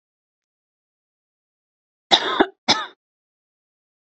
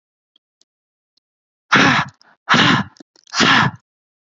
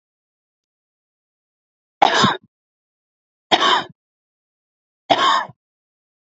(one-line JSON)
{"cough_length": "4.0 s", "cough_amplitude": 30675, "cough_signal_mean_std_ratio": 0.23, "exhalation_length": "4.4 s", "exhalation_amplitude": 28405, "exhalation_signal_mean_std_ratio": 0.4, "three_cough_length": "6.3 s", "three_cough_amplitude": 29205, "three_cough_signal_mean_std_ratio": 0.3, "survey_phase": "alpha (2021-03-01 to 2021-08-12)", "age": "18-44", "gender": "Female", "wearing_mask": "No", "symptom_abdominal_pain": true, "symptom_headache": true, "smoker_status": "Never smoked", "respiratory_condition_asthma": false, "respiratory_condition_other": false, "recruitment_source": "REACT", "submission_delay": "2 days", "covid_test_result": "Negative", "covid_test_method": "RT-qPCR"}